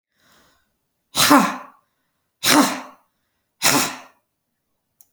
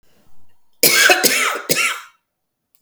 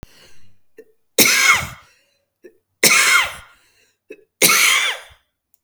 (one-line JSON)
{"exhalation_length": "5.1 s", "exhalation_amplitude": 32768, "exhalation_signal_mean_std_ratio": 0.34, "cough_length": "2.8 s", "cough_amplitude": 32768, "cough_signal_mean_std_ratio": 0.51, "three_cough_length": "5.6 s", "three_cough_amplitude": 32768, "three_cough_signal_mean_std_ratio": 0.44, "survey_phase": "beta (2021-08-13 to 2022-03-07)", "age": "45-64", "gender": "Female", "wearing_mask": "No", "symptom_cough_any": true, "symptom_runny_or_blocked_nose": true, "symptom_shortness_of_breath": true, "symptom_onset": "8 days", "smoker_status": "Never smoked", "respiratory_condition_asthma": false, "respiratory_condition_other": false, "recruitment_source": "REACT", "submission_delay": "3 days", "covid_test_result": "Negative", "covid_test_method": "RT-qPCR", "influenza_a_test_result": "Negative", "influenza_b_test_result": "Negative"}